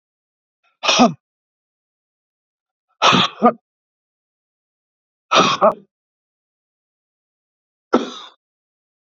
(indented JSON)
{
  "exhalation_length": "9.0 s",
  "exhalation_amplitude": 32767,
  "exhalation_signal_mean_std_ratio": 0.27,
  "survey_phase": "beta (2021-08-13 to 2022-03-07)",
  "age": "65+",
  "gender": "Male",
  "wearing_mask": "No",
  "symptom_cough_any": true,
  "symptom_sore_throat": true,
  "symptom_fatigue": true,
  "symptom_onset": "7 days",
  "smoker_status": "Never smoked",
  "respiratory_condition_asthma": true,
  "respiratory_condition_other": false,
  "recruitment_source": "Test and Trace",
  "submission_delay": "2 days",
  "covid_test_result": "Positive",
  "covid_test_method": "RT-qPCR",
  "covid_ct_value": 21.0,
  "covid_ct_gene": "ORF1ab gene",
  "covid_ct_mean": 21.3,
  "covid_viral_load": "100000 copies/ml",
  "covid_viral_load_category": "Low viral load (10K-1M copies/ml)"
}